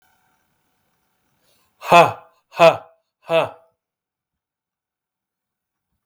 {
  "exhalation_length": "6.1 s",
  "exhalation_amplitude": 32766,
  "exhalation_signal_mean_std_ratio": 0.23,
  "survey_phase": "beta (2021-08-13 to 2022-03-07)",
  "age": "45-64",
  "gender": "Male",
  "wearing_mask": "No",
  "symptom_none": true,
  "smoker_status": "Never smoked",
  "respiratory_condition_asthma": true,
  "respiratory_condition_other": false,
  "recruitment_source": "REACT",
  "submission_delay": "1 day",
  "covid_test_result": "Negative",
  "covid_test_method": "RT-qPCR",
  "influenza_a_test_result": "Negative",
  "influenza_b_test_result": "Negative"
}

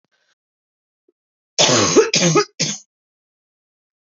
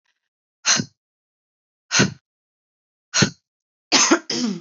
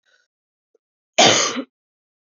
{
  "three_cough_length": "4.2 s",
  "three_cough_amplitude": 28921,
  "three_cough_signal_mean_std_ratio": 0.38,
  "exhalation_length": "4.6 s",
  "exhalation_amplitude": 32767,
  "exhalation_signal_mean_std_ratio": 0.36,
  "cough_length": "2.2 s",
  "cough_amplitude": 29716,
  "cough_signal_mean_std_ratio": 0.32,
  "survey_phase": "beta (2021-08-13 to 2022-03-07)",
  "age": "18-44",
  "gender": "Female",
  "wearing_mask": "No",
  "symptom_cough_any": true,
  "symptom_runny_or_blocked_nose": true,
  "symptom_shortness_of_breath": true,
  "symptom_sore_throat": true,
  "symptom_headache": true,
  "symptom_onset": "2 days",
  "smoker_status": "Never smoked",
  "respiratory_condition_asthma": false,
  "respiratory_condition_other": false,
  "recruitment_source": "Test and Trace",
  "submission_delay": "2 days",
  "covid_test_result": "Positive",
  "covid_test_method": "ePCR"
}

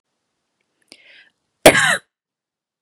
{
  "cough_length": "2.8 s",
  "cough_amplitude": 32768,
  "cough_signal_mean_std_ratio": 0.23,
  "survey_phase": "beta (2021-08-13 to 2022-03-07)",
  "age": "18-44",
  "gender": "Female",
  "wearing_mask": "No",
  "symptom_none": true,
  "smoker_status": "Ex-smoker",
  "respiratory_condition_asthma": false,
  "respiratory_condition_other": false,
  "recruitment_source": "REACT",
  "submission_delay": "0 days",
  "covid_test_result": "Negative",
  "covid_test_method": "RT-qPCR",
  "covid_ct_value": 37.5,
  "covid_ct_gene": "N gene",
  "influenza_a_test_result": "Negative",
  "influenza_b_test_result": "Negative"
}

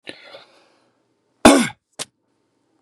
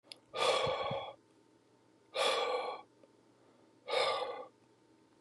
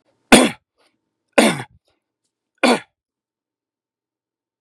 {
  "cough_length": "2.8 s",
  "cough_amplitude": 32768,
  "cough_signal_mean_std_ratio": 0.23,
  "exhalation_length": "5.2 s",
  "exhalation_amplitude": 4424,
  "exhalation_signal_mean_std_ratio": 0.53,
  "three_cough_length": "4.6 s",
  "three_cough_amplitude": 32768,
  "three_cough_signal_mean_std_ratio": 0.25,
  "survey_phase": "beta (2021-08-13 to 2022-03-07)",
  "age": "45-64",
  "gender": "Male",
  "wearing_mask": "No",
  "symptom_cough_any": true,
  "symptom_runny_or_blocked_nose": true,
  "symptom_onset": "4 days",
  "smoker_status": "Never smoked",
  "respiratory_condition_asthma": false,
  "respiratory_condition_other": false,
  "recruitment_source": "Test and Trace",
  "submission_delay": "2 days",
  "covid_test_result": "Positive",
  "covid_test_method": "RT-qPCR",
  "covid_ct_value": 17.5,
  "covid_ct_gene": "N gene"
}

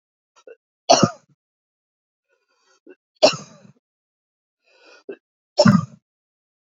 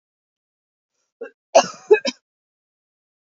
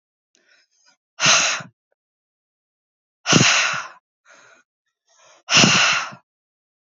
{
  "three_cough_length": "6.7 s",
  "three_cough_amplitude": 32767,
  "three_cough_signal_mean_std_ratio": 0.22,
  "cough_length": "3.3 s",
  "cough_amplitude": 30341,
  "cough_signal_mean_std_ratio": 0.2,
  "exhalation_length": "7.0 s",
  "exhalation_amplitude": 30297,
  "exhalation_signal_mean_std_ratio": 0.37,
  "survey_phase": "beta (2021-08-13 to 2022-03-07)",
  "age": "18-44",
  "gender": "Female",
  "wearing_mask": "No",
  "symptom_cough_any": true,
  "symptom_new_continuous_cough": true,
  "symptom_shortness_of_breath": true,
  "symptom_fatigue": true,
  "symptom_fever_high_temperature": true,
  "symptom_headache": true,
  "symptom_change_to_sense_of_smell_or_taste": true,
  "smoker_status": "Never smoked",
  "respiratory_condition_asthma": false,
  "respiratory_condition_other": false,
  "recruitment_source": "Test and Trace",
  "submission_delay": "1 day",
  "covid_test_result": "Positive",
  "covid_test_method": "LFT"
}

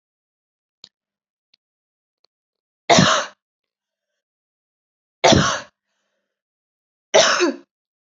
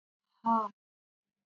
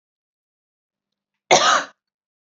{
  "three_cough_length": "8.2 s",
  "three_cough_amplitude": 29768,
  "three_cough_signal_mean_std_ratio": 0.28,
  "exhalation_length": "1.5 s",
  "exhalation_amplitude": 4545,
  "exhalation_signal_mean_std_ratio": 0.31,
  "cough_length": "2.5 s",
  "cough_amplitude": 29809,
  "cough_signal_mean_std_ratio": 0.28,
  "survey_phase": "beta (2021-08-13 to 2022-03-07)",
  "age": "18-44",
  "gender": "Female",
  "wearing_mask": "No",
  "symptom_fatigue": true,
  "symptom_fever_high_temperature": true,
  "symptom_headache": true,
  "symptom_other": true,
  "symptom_onset": "3 days",
  "smoker_status": "Never smoked",
  "respiratory_condition_asthma": false,
  "respiratory_condition_other": false,
  "recruitment_source": "Test and Trace",
  "submission_delay": "2 days",
  "covid_test_result": "Positive",
  "covid_test_method": "RT-qPCR",
  "covid_ct_value": 20.6,
  "covid_ct_gene": "N gene",
  "covid_ct_mean": 20.6,
  "covid_viral_load": "170000 copies/ml",
  "covid_viral_load_category": "Low viral load (10K-1M copies/ml)"
}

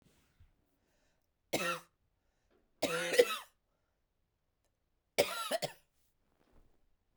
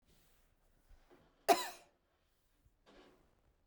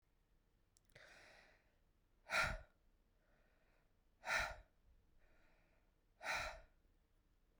{
  "three_cough_length": "7.2 s",
  "three_cough_amplitude": 8789,
  "three_cough_signal_mean_std_ratio": 0.28,
  "cough_length": "3.7 s",
  "cough_amplitude": 6615,
  "cough_signal_mean_std_ratio": 0.18,
  "exhalation_length": "7.6 s",
  "exhalation_amplitude": 1616,
  "exhalation_signal_mean_std_ratio": 0.31,
  "survey_phase": "beta (2021-08-13 to 2022-03-07)",
  "age": "18-44",
  "gender": "Female",
  "wearing_mask": "No",
  "symptom_cough_any": true,
  "symptom_runny_or_blocked_nose": true,
  "symptom_abdominal_pain": true,
  "symptom_diarrhoea": true,
  "symptom_fatigue": true,
  "symptom_fever_high_temperature": true,
  "symptom_headache": true,
  "symptom_change_to_sense_of_smell_or_taste": true,
  "symptom_loss_of_taste": true,
  "smoker_status": "Ex-smoker",
  "respiratory_condition_asthma": false,
  "respiratory_condition_other": false,
  "recruitment_source": "Test and Trace",
  "submission_delay": "2 days",
  "covid_test_result": "Positive",
  "covid_test_method": "LFT"
}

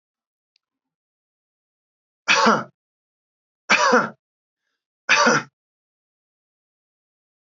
{
  "three_cough_length": "7.5 s",
  "three_cough_amplitude": 25372,
  "three_cough_signal_mean_std_ratio": 0.29,
  "survey_phase": "alpha (2021-03-01 to 2021-08-12)",
  "age": "65+",
  "gender": "Male",
  "wearing_mask": "No",
  "symptom_none": true,
  "smoker_status": "Never smoked",
  "respiratory_condition_asthma": false,
  "respiratory_condition_other": false,
  "recruitment_source": "REACT",
  "submission_delay": "1 day",
  "covid_test_result": "Negative",
  "covid_test_method": "RT-qPCR"
}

